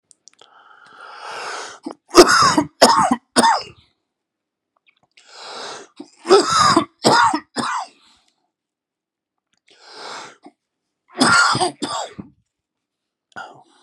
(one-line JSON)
{"three_cough_length": "13.8 s", "three_cough_amplitude": 32768, "three_cough_signal_mean_std_ratio": 0.38, "survey_phase": "beta (2021-08-13 to 2022-03-07)", "age": "45-64", "gender": "Male", "wearing_mask": "No", "symptom_cough_any": true, "symptom_runny_or_blocked_nose": true, "symptom_shortness_of_breath": true, "symptom_fatigue": true, "symptom_headache": true, "symptom_loss_of_taste": true, "symptom_onset": "2 days", "smoker_status": "Never smoked", "respiratory_condition_asthma": false, "respiratory_condition_other": false, "recruitment_source": "Test and Trace", "submission_delay": "2 days", "covid_test_result": "Positive", "covid_test_method": "RT-qPCR", "covid_ct_value": 14.6, "covid_ct_gene": "ORF1ab gene", "covid_ct_mean": 15.0, "covid_viral_load": "12000000 copies/ml", "covid_viral_load_category": "High viral load (>1M copies/ml)"}